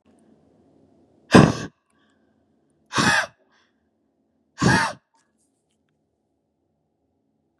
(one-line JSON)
{"exhalation_length": "7.6 s", "exhalation_amplitude": 32768, "exhalation_signal_mean_std_ratio": 0.24, "survey_phase": "beta (2021-08-13 to 2022-03-07)", "age": "18-44", "gender": "Female", "wearing_mask": "No", "symptom_none": true, "smoker_status": "Never smoked", "respiratory_condition_asthma": false, "respiratory_condition_other": false, "recruitment_source": "REACT", "submission_delay": "2 days", "covid_test_result": "Negative", "covid_test_method": "RT-qPCR", "influenza_a_test_result": "Negative", "influenza_b_test_result": "Negative"}